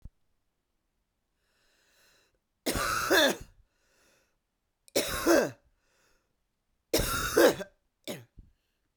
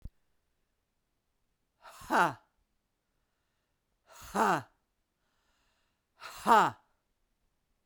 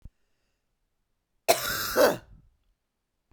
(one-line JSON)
{"three_cough_length": "9.0 s", "three_cough_amplitude": 13298, "three_cough_signal_mean_std_ratio": 0.34, "exhalation_length": "7.9 s", "exhalation_amplitude": 9180, "exhalation_signal_mean_std_ratio": 0.24, "cough_length": "3.3 s", "cough_amplitude": 15466, "cough_signal_mean_std_ratio": 0.31, "survey_phase": "beta (2021-08-13 to 2022-03-07)", "age": "45-64", "gender": "Female", "wearing_mask": "No", "symptom_cough_any": true, "symptom_runny_or_blocked_nose": true, "symptom_sore_throat": true, "symptom_abdominal_pain": true, "symptom_fatigue": true, "symptom_headache": true, "symptom_change_to_sense_of_smell_or_taste": true, "symptom_loss_of_taste": true, "symptom_other": true, "symptom_onset": "3 days", "smoker_status": "Never smoked", "respiratory_condition_asthma": false, "respiratory_condition_other": false, "recruitment_source": "Test and Trace", "submission_delay": "2 days", "covid_test_result": "Positive", "covid_test_method": "RT-qPCR"}